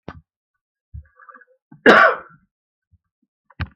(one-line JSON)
{"cough_length": "3.8 s", "cough_amplitude": 32768, "cough_signal_mean_std_ratio": 0.24, "survey_phase": "beta (2021-08-13 to 2022-03-07)", "age": "65+", "gender": "Male", "wearing_mask": "No", "symptom_none": true, "smoker_status": "Never smoked", "respiratory_condition_asthma": false, "respiratory_condition_other": false, "recruitment_source": "REACT", "submission_delay": "2 days", "covid_test_result": "Negative", "covid_test_method": "RT-qPCR", "influenza_a_test_result": "Negative", "influenza_b_test_result": "Negative"}